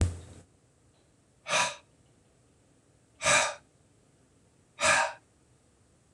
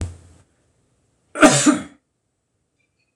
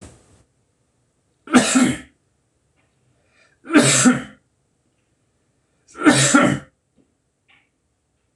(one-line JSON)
{"exhalation_length": "6.1 s", "exhalation_amplitude": 10297, "exhalation_signal_mean_std_ratio": 0.34, "cough_length": "3.2 s", "cough_amplitude": 26028, "cough_signal_mean_std_ratio": 0.29, "three_cough_length": "8.4 s", "three_cough_amplitude": 26028, "three_cough_signal_mean_std_ratio": 0.34, "survey_phase": "beta (2021-08-13 to 2022-03-07)", "age": "45-64", "gender": "Male", "wearing_mask": "No", "symptom_none": true, "smoker_status": "Never smoked", "respiratory_condition_asthma": false, "respiratory_condition_other": false, "recruitment_source": "REACT", "submission_delay": "2 days", "covid_test_result": "Negative", "covid_test_method": "RT-qPCR", "influenza_a_test_result": "Negative", "influenza_b_test_result": "Negative"}